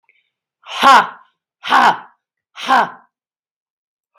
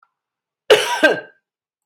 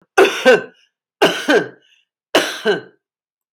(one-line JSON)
{"exhalation_length": "4.2 s", "exhalation_amplitude": 32768, "exhalation_signal_mean_std_ratio": 0.35, "cough_length": "1.9 s", "cough_amplitude": 32768, "cough_signal_mean_std_ratio": 0.34, "three_cough_length": "3.5 s", "three_cough_amplitude": 32768, "three_cough_signal_mean_std_ratio": 0.42, "survey_phase": "beta (2021-08-13 to 2022-03-07)", "age": "45-64", "gender": "Female", "wearing_mask": "No", "symptom_none": true, "smoker_status": "Current smoker (e-cigarettes or vapes only)", "respiratory_condition_asthma": false, "respiratory_condition_other": false, "recruitment_source": "REACT", "submission_delay": "1 day", "covid_test_result": "Negative", "covid_test_method": "RT-qPCR", "influenza_a_test_result": "Negative", "influenza_b_test_result": "Negative"}